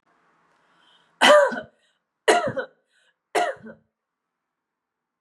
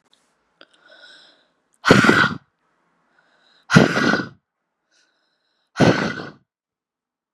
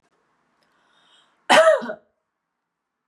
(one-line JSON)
{"three_cough_length": "5.2 s", "three_cough_amplitude": 25428, "three_cough_signal_mean_std_ratio": 0.3, "exhalation_length": "7.3 s", "exhalation_amplitude": 32768, "exhalation_signal_mean_std_ratio": 0.31, "cough_length": "3.1 s", "cough_amplitude": 28087, "cough_signal_mean_std_ratio": 0.27, "survey_phase": "beta (2021-08-13 to 2022-03-07)", "age": "18-44", "gender": "Female", "wearing_mask": "No", "symptom_none": true, "smoker_status": "Ex-smoker", "respiratory_condition_asthma": false, "respiratory_condition_other": false, "recruitment_source": "REACT", "submission_delay": "3 days", "covid_test_result": "Negative", "covid_test_method": "RT-qPCR", "influenza_a_test_result": "Negative", "influenza_b_test_result": "Negative"}